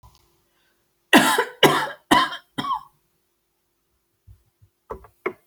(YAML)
cough_length: 5.5 s
cough_amplitude: 30250
cough_signal_mean_std_ratio: 0.32
survey_phase: alpha (2021-03-01 to 2021-08-12)
age: 65+
gender: Female
wearing_mask: 'No'
symptom_none: true
smoker_status: Never smoked
respiratory_condition_asthma: false
respiratory_condition_other: false
recruitment_source: REACT
submission_delay: 2 days
covid_test_result: Negative
covid_test_method: RT-qPCR